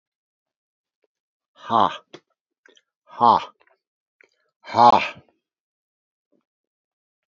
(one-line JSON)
{"exhalation_length": "7.3 s", "exhalation_amplitude": 26545, "exhalation_signal_mean_std_ratio": 0.23, "survey_phase": "beta (2021-08-13 to 2022-03-07)", "age": "65+", "gender": "Male", "wearing_mask": "No", "symptom_cough_any": true, "symptom_runny_or_blocked_nose": true, "symptom_onset": "5 days", "smoker_status": "Never smoked", "respiratory_condition_asthma": false, "respiratory_condition_other": false, "recruitment_source": "Test and Trace", "submission_delay": "1 day", "covid_test_result": "Positive", "covid_test_method": "RT-qPCR", "covid_ct_value": 14.6, "covid_ct_gene": "ORF1ab gene", "covid_ct_mean": 15.7, "covid_viral_load": "7000000 copies/ml", "covid_viral_load_category": "High viral load (>1M copies/ml)"}